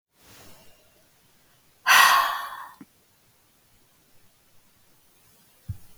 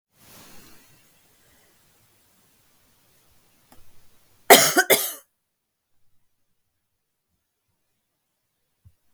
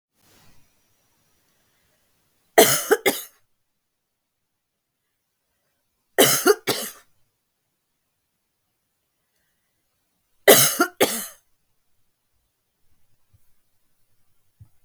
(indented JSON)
{
  "exhalation_length": "6.0 s",
  "exhalation_amplitude": 22932,
  "exhalation_signal_mean_std_ratio": 0.27,
  "cough_length": "9.1 s",
  "cough_amplitude": 32768,
  "cough_signal_mean_std_ratio": 0.17,
  "three_cough_length": "14.8 s",
  "three_cough_amplitude": 32768,
  "three_cough_signal_mean_std_ratio": 0.22,
  "survey_phase": "beta (2021-08-13 to 2022-03-07)",
  "age": "65+",
  "gender": "Female",
  "wearing_mask": "No",
  "symptom_cough_any": true,
  "symptom_fatigue": true,
  "symptom_headache": true,
  "symptom_loss_of_taste": true,
  "symptom_onset": "6 days",
  "smoker_status": "Ex-smoker",
  "respiratory_condition_asthma": false,
  "respiratory_condition_other": false,
  "recruitment_source": "REACT",
  "submission_delay": "1 day",
  "covid_test_result": "Negative",
  "covid_test_method": "RT-qPCR",
  "influenza_a_test_result": "Negative",
  "influenza_b_test_result": "Negative"
}